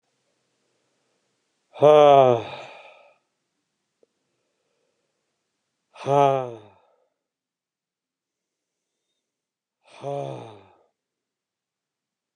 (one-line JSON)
{"exhalation_length": "12.4 s", "exhalation_amplitude": 20366, "exhalation_signal_mean_std_ratio": 0.22, "survey_phase": "beta (2021-08-13 to 2022-03-07)", "age": "45-64", "gender": "Male", "wearing_mask": "No", "symptom_none": true, "smoker_status": "Never smoked", "respiratory_condition_asthma": false, "respiratory_condition_other": false, "recruitment_source": "REACT", "submission_delay": "3 days", "covid_test_result": "Negative", "covid_test_method": "RT-qPCR", "influenza_a_test_result": "Negative", "influenza_b_test_result": "Negative"}